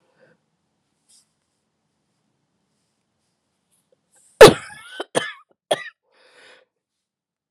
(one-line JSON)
{"cough_length": "7.5 s", "cough_amplitude": 32768, "cough_signal_mean_std_ratio": 0.14, "survey_phase": "beta (2021-08-13 to 2022-03-07)", "age": "45-64", "gender": "Female", "wearing_mask": "No", "symptom_cough_any": true, "symptom_runny_or_blocked_nose": true, "symptom_shortness_of_breath": true, "symptom_fatigue": true, "symptom_fever_high_temperature": true, "symptom_headache": true, "symptom_onset": "3 days", "smoker_status": "Never smoked", "respiratory_condition_asthma": false, "respiratory_condition_other": false, "recruitment_source": "Test and Trace", "submission_delay": "2 days", "covid_test_result": "Positive", "covid_test_method": "RT-qPCR", "covid_ct_value": 23.4, "covid_ct_gene": "N gene"}